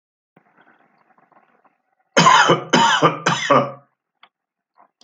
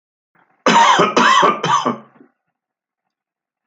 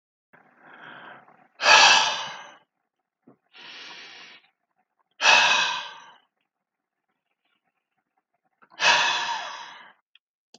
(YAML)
three_cough_length: 5.0 s
three_cough_amplitude: 31070
three_cough_signal_mean_std_ratio: 0.4
cough_length: 3.7 s
cough_amplitude: 29560
cough_signal_mean_std_ratio: 0.48
exhalation_length: 10.6 s
exhalation_amplitude: 24667
exhalation_signal_mean_std_ratio: 0.33
survey_phase: alpha (2021-03-01 to 2021-08-12)
age: 65+
gender: Male
wearing_mask: 'No'
symptom_none: true
smoker_status: Ex-smoker
respiratory_condition_asthma: false
respiratory_condition_other: false
recruitment_source: REACT
submission_delay: 1 day
covid_test_result: Negative
covid_test_method: RT-qPCR